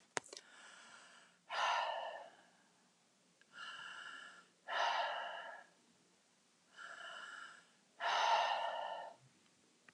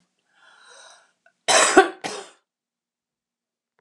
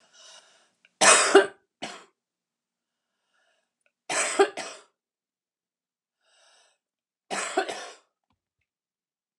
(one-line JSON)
{"exhalation_length": "9.9 s", "exhalation_amplitude": 4366, "exhalation_signal_mean_std_ratio": 0.49, "cough_length": "3.8 s", "cough_amplitude": 32767, "cough_signal_mean_std_ratio": 0.25, "three_cough_length": "9.4 s", "three_cough_amplitude": 27380, "three_cough_signal_mean_std_ratio": 0.25, "survey_phase": "alpha (2021-03-01 to 2021-08-12)", "age": "65+", "gender": "Female", "wearing_mask": "No", "symptom_none": true, "smoker_status": "Current smoker (1 to 10 cigarettes per day)", "respiratory_condition_asthma": true, "respiratory_condition_other": false, "recruitment_source": "REACT", "submission_delay": "1 day", "covid_test_result": "Negative", "covid_test_method": "RT-qPCR"}